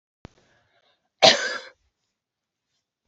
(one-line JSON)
{"cough_length": "3.1 s", "cough_amplitude": 29121, "cough_signal_mean_std_ratio": 0.21, "survey_phase": "beta (2021-08-13 to 2022-03-07)", "age": "45-64", "gender": "Female", "wearing_mask": "No", "symptom_none": true, "smoker_status": "Never smoked", "respiratory_condition_asthma": false, "respiratory_condition_other": false, "recruitment_source": "REACT", "submission_delay": "3 days", "covid_test_result": "Negative", "covid_test_method": "RT-qPCR", "influenza_a_test_result": "Negative", "influenza_b_test_result": "Negative"}